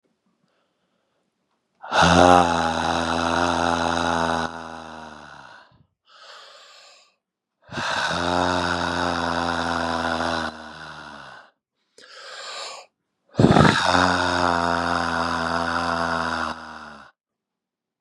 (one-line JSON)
{"exhalation_length": "18.0 s", "exhalation_amplitude": 32712, "exhalation_signal_mean_std_ratio": 0.54, "survey_phase": "beta (2021-08-13 to 2022-03-07)", "age": "18-44", "gender": "Male", "wearing_mask": "No", "symptom_cough_any": true, "symptom_runny_or_blocked_nose": true, "symptom_fatigue": true, "symptom_headache": true, "smoker_status": "Current smoker (e-cigarettes or vapes only)", "respiratory_condition_asthma": true, "respiratory_condition_other": false, "recruitment_source": "Test and Trace", "submission_delay": "1 day", "covid_test_result": "Positive", "covid_test_method": "LFT"}